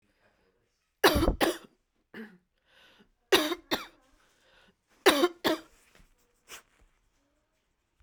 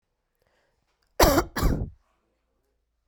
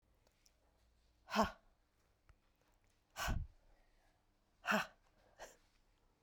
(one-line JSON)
{"three_cough_length": "8.0 s", "three_cough_amplitude": 21085, "three_cough_signal_mean_std_ratio": 0.28, "cough_length": "3.1 s", "cough_amplitude": 21659, "cough_signal_mean_std_ratio": 0.32, "exhalation_length": "6.2 s", "exhalation_amplitude": 2669, "exhalation_signal_mean_std_ratio": 0.27, "survey_phase": "beta (2021-08-13 to 2022-03-07)", "age": "18-44", "gender": "Female", "wearing_mask": "No", "symptom_cough_any": true, "symptom_new_continuous_cough": true, "symptom_shortness_of_breath": true, "symptom_sore_throat": true, "symptom_diarrhoea": true, "symptom_fatigue": true, "symptom_headache": true, "symptom_onset": "4 days", "smoker_status": "Never smoked", "respiratory_condition_asthma": false, "respiratory_condition_other": false, "recruitment_source": "Test and Trace", "submission_delay": "1 day", "covid_test_result": "Positive", "covid_test_method": "RT-qPCR", "covid_ct_value": 26.2, "covid_ct_gene": "N gene", "covid_ct_mean": 26.3, "covid_viral_load": "2400 copies/ml", "covid_viral_load_category": "Minimal viral load (< 10K copies/ml)"}